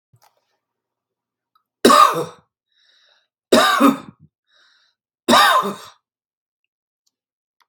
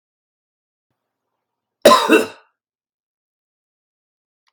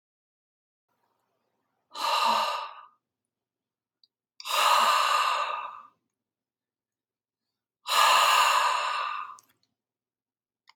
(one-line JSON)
{"three_cough_length": "7.7 s", "three_cough_amplitude": 32768, "three_cough_signal_mean_std_ratio": 0.32, "cough_length": "4.5 s", "cough_amplitude": 32768, "cough_signal_mean_std_ratio": 0.22, "exhalation_length": "10.8 s", "exhalation_amplitude": 13584, "exhalation_signal_mean_std_ratio": 0.45, "survey_phase": "beta (2021-08-13 to 2022-03-07)", "age": "45-64", "gender": "Male", "wearing_mask": "No", "symptom_none": true, "smoker_status": "Current smoker (1 to 10 cigarettes per day)", "respiratory_condition_asthma": false, "respiratory_condition_other": false, "recruitment_source": "REACT", "submission_delay": "2 days", "covid_test_result": "Negative", "covid_test_method": "RT-qPCR", "influenza_a_test_result": "Negative", "influenza_b_test_result": "Negative"}